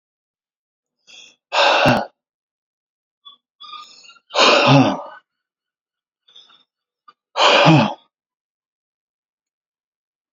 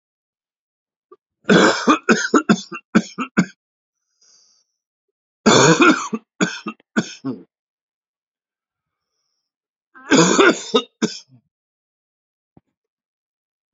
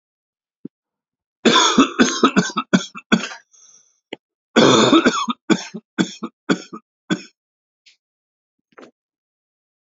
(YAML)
exhalation_length: 10.3 s
exhalation_amplitude: 30945
exhalation_signal_mean_std_ratio: 0.34
three_cough_length: 13.7 s
three_cough_amplitude: 32631
three_cough_signal_mean_std_ratio: 0.34
cough_length: 10.0 s
cough_amplitude: 32767
cough_signal_mean_std_ratio: 0.37
survey_phase: alpha (2021-03-01 to 2021-08-12)
age: 45-64
gender: Male
wearing_mask: 'No'
symptom_cough_any: true
symptom_new_continuous_cough: true
symptom_headache: true
symptom_onset: 3 days
smoker_status: Never smoked
respiratory_condition_asthma: false
respiratory_condition_other: false
recruitment_source: Test and Trace
submission_delay: 2 days
covid_test_result: Positive
covid_test_method: RT-qPCR